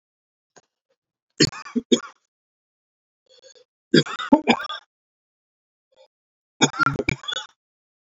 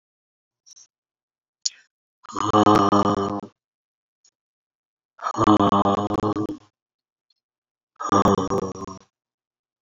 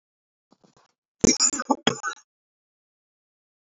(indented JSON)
{
  "three_cough_length": "8.1 s",
  "three_cough_amplitude": 28706,
  "three_cough_signal_mean_std_ratio": 0.26,
  "exhalation_length": "9.8 s",
  "exhalation_amplitude": 29830,
  "exhalation_signal_mean_std_ratio": 0.4,
  "cough_length": "3.7 s",
  "cough_amplitude": 24742,
  "cough_signal_mean_std_ratio": 0.26,
  "survey_phase": "beta (2021-08-13 to 2022-03-07)",
  "age": "65+",
  "gender": "Male",
  "wearing_mask": "No",
  "symptom_cough_any": true,
  "symptom_shortness_of_breath": true,
  "symptom_sore_throat": true,
  "symptom_diarrhoea": true,
  "symptom_fatigue": true,
  "symptom_onset": "5 days",
  "smoker_status": "Never smoked",
  "respiratory_condition_asthma": false,
  "respiratory_condition_other": false,
  "recruitment_source": "Test and Trace",
  "submission_delay": "2 days",
  "covid_test_result": "Positive",
  "covid_test_method": "RT-qPCR",
  "covid_ct_value": 14.8,
  "covid_ct_gene": "N gene"
}